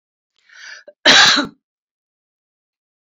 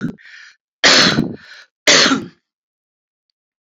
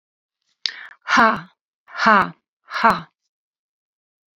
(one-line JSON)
{"cough_length": "3.1 s", "cough_amplitude": 32043, "cough_signal_mean_std_ratio": 0.3, "three_cough_length": "3.7 s", "three_cough_amplitude": 32011, "three_cough_signal_mean_std_ratio": 0.4, "exhalation_length": "4.4 s", "exhalation_amplitude": 32767, "exhalation_signal_mean_std_ratio": 0.32, "survey_phase": "beta (2021-08-13 to 2022-03-07)", "age": "45-64", "gender": "Female", "wearing_mask": "No", "symptom_none": true, "smoker_status": "Ex-smoker", "respiratory_condition_asthma": false, "respiratory_condition_other": false, "recruitment_source": "REACT", "submission_delay": "2 days", "covid_test_result": "Negative", "covid_test_method": "RT-qPCR", "influenza_a_test_result": "Negative", "influenza_b_test_result": "Negative"}